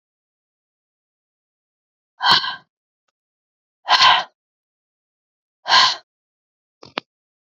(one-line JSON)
{"exhalation_length": "7.5 s", "exhalation_amplitude": 32768, "exhalation_signal_mean_std_ratio": 0.26, "survey_phase": "beta (2021-08-13 to 2022-03-07)", "age": "45-64", "gender": "Female", "wearing_mask": "No", "symptom_none": true, "smoker_status": "Never smoked", "respiratory_condition_asthma": false, "respiratory_condition_other": false, "recruitment_source": "REACT", "submission_delay": "2 days", "covid_test_result": "Negative", "covid_test_method": "RT-qPCR", "influenza_a_test_result": "Unknown/Void", "influenza_b_test_result": "Unknown/Void"}